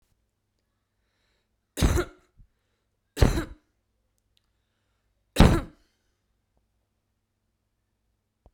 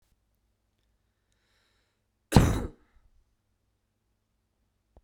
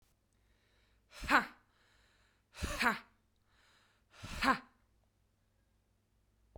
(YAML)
three_cough_length: 8.5 s
three_cough_amplitude: 26900
three_cough_signal_mean_std_ratio: 0.21
cough_length: 5.0 s
cough_amplitude: 24408
cough_signal_mean_std_ratio: 0.17
exhalation_length: 6.6 s
exhalation_amplitude: 7643
exhalation_signal_mean_std_ratio: 0.26
survey_phase: beta (2021-08-13 to 2022-03-07)
age: 18-44
gender: Female
wearing_mask: 'No'
symptom_runny_or_blocked_nose: true
smoker_status: Ex-smoker
respiratory_condition_asthma: false
respiratory_condition_other: false
recruitment_source: REACT
submission_delay: 1 day
covid_test_result: Negative
covid_test_method: RT-qPCR